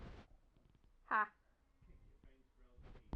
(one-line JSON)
{"exhalation_length": "3.2 s", "exhalation_amplitude": 2104, "exhalation_signal_mean_std_ratio": 0.29, "survey_phase": "alpha (2021-03-01 to 2021-08-12)", "age": "45-64", "gender": "Female", "wearing_mask": "No", "symptom_fatigue": true, "smoker_status": "Never smoked", "respiratory_condition_asthma": false, "respiratory_condition_other": false, "recruitment_source": "Test and Trace", "submission_delay": "2 days", "covid_test_result": "Positive", "covid_test_method": "RT-qPCR", "covid_ct_value": 19.9, "covid_ct_gene": "ORF1ab gene", "covid_ct_mean": 20.8, "covid_viral_load": "150000 copies/ml", "covid_viral_load_category": "Low viral load (10K-1M copies/ml)"}